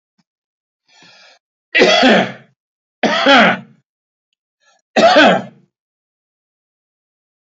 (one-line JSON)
{"three_cough_length": "7.4 s", "three_cough_amplitude": 30373, "three_cough_signal_mean_std_ratio": 0.38, "survey_phase": "alpha (2021-03-01 to 2021-08-12)", "age": "65+", "gender": "Male", "wearing_mask": "No", "symptom_none": true, "smoker_status": "Never smoked", "respiratory_condition_asthma": false, "respiratory_condition_other": false, "recruitment_source": "REACT", "submission_delay": "1 day", "covid_test_result": "Negative", "covid_test_method": "RT-qPCR"}